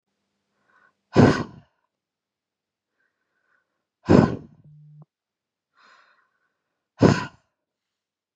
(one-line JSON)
{"exhalation_length": "8.4 s", "exhalation_amplitude": 31118, "exhalation_signal_mean_std_ratio": 0.21, "survey_phase": "beta (2021-08-13 to 2022-03-07)", "age": "18-44", "gender": "Female", "wearing_mask": "No", "symptom_new_continuous_cough": true, "symptom_runny_or_blocked_nose": true, "symptom_shortness_of_breath": true, "symptom_fatigue": true, "symptom_headache": true, "symptom_onset": "3 days", "smoker_status": "Never smoked", "respiratory_condition_asthma": false, "respiratory_condition_other": false, "recruitment_source": "REACT", "submission_delay": "1 day", "covid_test_result": "Positive", "covid_test_method": "RT-qPCR", "covid_ct_value": 22.6, "covid_ct_gene": "E gene", "influenza_a_test_result": "Negative", "influenza_b_test_result": "Negative"}